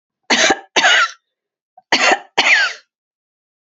cough_length: 3.7 s
cough_amplitude: 32767
cough_signal_mean_std_ratio: 0.48
survey_phase: beta (2021-08-13 to 2022-03-07)
age: 65+
gender: Female
wearing_mask: 'No'
symptom_runny_or_blocked_nose: true
symptom_onset: 5 days
smoker_status: Never smoked
respiratory_condition_asthma: false
respiratory_condition_other: false
recruitment_source: REACT
submission_delay: 3 days
covid_test_result: Negative
covid_test_method: RT-qPCR
influenza_a_test_result: Negative
influenza_b_test_result: Negative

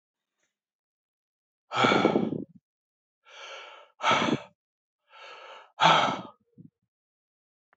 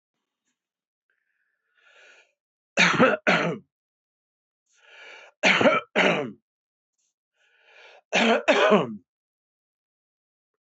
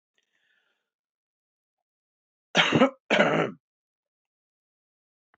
exhalation_length: 7.8 s
exhalation_amplitude: 15027
exhalation_signal_mean_std_ratio: 0.34
three_cough_length: 10.7 s
three_cough_amplitude: 21623
three_cough_signal_mean_std_ratio: 0.35
cough_length: 5.4 s
cough_amplitude: 18401
cough_signal_mean_std_ratio: 0.28
survey_phase: beta (2021-08-13 to 2022-03-07)
age: 65+
gender: Male
wearing_mask: 'No'
symptom_cough_any: true
symptom_runny_or_blocked_nose: true
symptom_change_to_sense_of_smell_or_taste: true
symptom_onset: 4 days
smoker_status: Ex-smoker
respiratory_condition_asthma: false
respiratory_condition_other: false
recruitment_source: REACT
submission_delay: 2 days
covid_test_result: Positive
covid_test_method: RT-qPCR
covid_ct_value: 18.0
covid_ct_gene: E gene
influenza_a_test_result: Negative
influenza_b_test_result: Negative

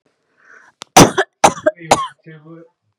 three_cough_length: 3.0 s
three_cough_amplitude: 32768
three_cough_signal_mean_std_ratio: 0.3
survey_phase: beta (2021-08-13 to 2022-03-07)
age: 18-44
gender: Female
wearing_mask: 'No'
symptom_none: true
smoker_status: Never smoked
respiratory_condition_asthma: false
respiratory_condition_other: false
recruitment_source: REACT
submission_delay: 3 days
covid_test_result: Negative
covid_test_method: RT-qPCR
influenza_a_test_result: Negative
influenza_b_test_result: Negative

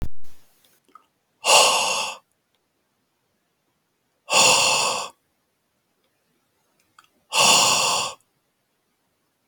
exhalation_length: 9.5 s
exhalation_amplitude: 28072
exhalation_signal_mean_std_ratio: 0.42
survey_phase: beta (2021-08-13 to 2022-03-07)
age: 18-44
gender: Male
wearing_mask: 'No'
symptom_none: true
smoker_status: Never smoked
respiratory_condition_asthma: false
respiratory_condition_other: false
recruitment_source: REACT
submission_delay: 0 days
covid_test_result: Negative
covid_test_method: RT-qPCR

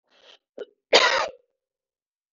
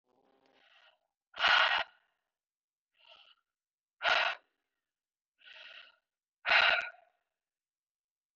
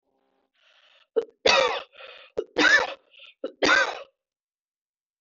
cough_length: 2.3 s
cough_amplitude: 24750
cough_signal_mean_std_ratio: 0.29
exhalation_length: 8.4 s
exhalation_amplitude: 8414
exhalation_signal_mean_std_ratio: 0.29
three_cough_length: 5.2 s
three_cough_amplitude: 19477
three_cough_signal_mean_std_ratio: 0.37
survey_phase: beta (2021-08-13 to 2022-03-07)
age: 18-44
gender: Female
wearing_mask: 'No'
symptom_none: true
smoker_status: Never smoked
respiratory_condition_asthma: false
respiratory_condition_other: false
recruitment_source: REACT
submission_delay: 2 days
covid_test_result: Negative
covid_test_method: RT-qPCR
influenza_a_test_result: Negative
influenza_b_test_result: Negative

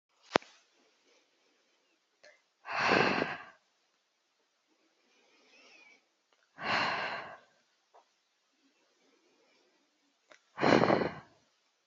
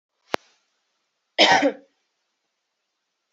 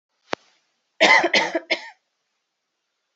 exhalation_length: 11.9 s
exhalation_amplitude: 26938
exhalation_signal_mean_std_ratio: 0.29
cough_length: 3.3 s
cough_amplitude: 32767
cough_signal_mean_std_ratio: 0.25
three_cough_length: 3.2 s
three_cough_amplitude: 29742
three_cough_signal_mean_std_ratio: 0.33
survey_phase: alpha (2021-03-01 to 2021-08-12)
age: 18-44
gender: Female
wearing_mask: 'No'
symptom_new_continuous_cough: true
symptom_shortness_of_breath: true
symptom_fatigue: true
symptom_fever_high_temperature: true
symptom_headache: true
symptom_change_to_sense_of_smell_or_taste: true
symptom_onset: 6 days
smoker_status: Never smoked
respiratory_condition_asthma: false
respiratory_condition_other: false
recruitment_source: Test and Trace
submission_delay: 1 day
covid_test_result: Positive
covid_test_method: RT-qPCR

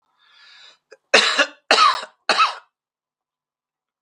three_cough_length: 4.0 s
three_cough_amplitude: 32768
three_cough_signal_mean_std_ratio: 0.36
survey_phase: beta (2021-08-13 to 2022-03-07)
age: 65+
gender: Male
wearing_mask: 'No'
symptom_none: true
smoker_status: Never smoked
respiratory_condition_asthma: false
respiratory_condition_other: false
recruitment_source: REACT
submission_delay: 0 days
covid_test_result: Negative
covid_test_method: RT-qPCR
influenza_a_test_result: Negative
influenza_b_test_result: Negative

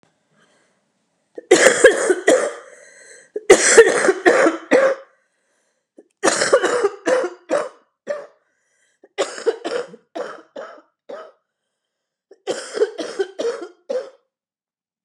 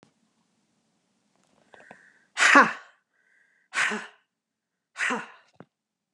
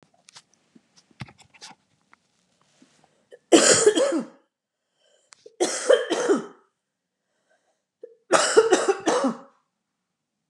cough_length: 15.0 s
cough_amplitude: 32768
cough_signal_mean_std_ratio: 0.4
exhalation_length: 6.1 s
exhalation_amplitude: 29449
exhalation_signal_mean_std_ratio: 0.25
three_cough_length: 10.5 s
three_cough_amplitude: 30766
three_cough_signal_mean_std_ratio: 0.35
survey_phase: beta (2021-08-13 to 2022-03-07)
age: 65+
gender: Female
wearing_mask: 'No'
symptom_cough_any: true
symptom_runny_or_blocked_nose: true
symptom_sore_throat: true
symptom_fatigue: true
symptom_headache: true
smoker_status: Ex-smoker
respiratory_condition_asthma: false
respiratory_condition_other: false
recruitment_source: Test and Trace
submission_delay: 1 day
covid_test_result: Positive
covid_test_method: RT-qPCR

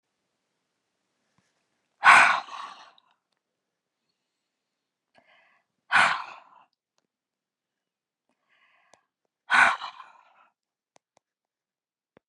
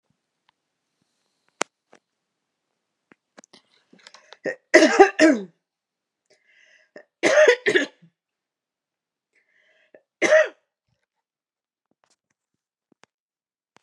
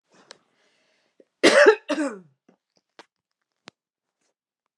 exhalation_length: 12.3 s
exhalation_amplitude: 28031
exhalation_signal_mean_std_ratio: 0.21
three_cough_length: 13.8 s
three_cough_amplitude: 32746
three_cough_signal_mean_std_ratio: 0.24
cough_length: 4.8 s
cough_amplitude: 27410
cough_signal_mean_std_ratio: 0.24
survey_phase: beta (2021-08-13 to 2022-03-07)
age: 45-64
gender: Female
wearing_mask: 'No'
symptom_none: true
smoker_status: Never smoked
respiratory_condition_asthma: false
respiratory_condition_other: false
recruitment_source: REACT
submission_delay: 1 day
covid_test_result: Negative
covid_test_method: RT-qPCR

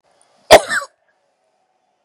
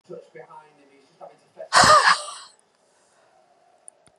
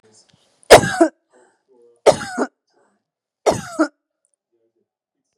cough_length: 2.0 s
cough_amplitude: 32768
cough_signal_mean_std_ratio: 0.23
exhalation_length: 4.2 s
exhalation_amplitude: 27574
exhalation_signal_mean_std_ratio: 0.29
three_cough_length: 5.4 s
three_cough_amplitude: 32768
three_cough_signal_mean_std_ratio: 0.25
survey_phase: beta (2021-08-13 to 2022-03-07)
age: 45-64
gender: Female
wearing_mask: 'No'
symptom_none: true
smoker_status: Never smoked
respiratory_condition_asthma: false
respiratory_condition_other: false
recruitment_source: REACT
submission_delay: 2 days
covid_test_result: Negative
covid_test_method: RT-qPCR
influenza_a_test_result: Negative
influenza_b_test_result: Negative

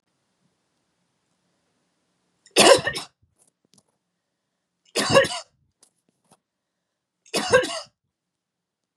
three_cough_length: 9.0 s
three_cough_amplitude: 30181
three_cough_signal_mean_std_ratio: 0.24
survey_phase: beta (2021-08-13 to 2022-03-07)
age: 18-44
gender: Female
wearing_mask: 'No'
symptom_headache: true
smoker_status: Never smoked
respiratory_condition_asthma: false
respiratory_condition_other: false
recruitment_source: Test and Trace
submission_delay: 1 day
covid_test_result: Positive
covid_test_method: ePCR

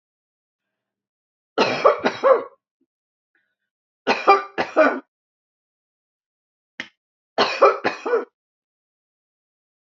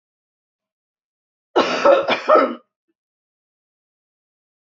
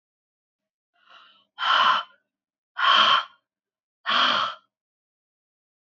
three_cough_length: 9.8 s
three_cough_amplitude: 27523
three_cough_signal_mean_std_ratio: 0.32
cough_length: 4.8 s
cough_amplitude: 28251
cough_signal_mean_std_ratio: 0.31
exhalation_length: 6.0 s
exhalation_amplitude: 17646
exhalation_signal_mean_std_ratio: 0.38
survey_phase: alpha (2021-03-01 to 2021-08-12)
age: 45-64
gender: Female
wearing_mask: 'No'
symptom_none: true
smoker_status: Never smoked
respiratory_condition_asthma: false
respiratory_condition_other: false
recruitment_source: REACT
submission_delay: 16 days
covid_test_result: Negative
covid_test_method: RT-qPCR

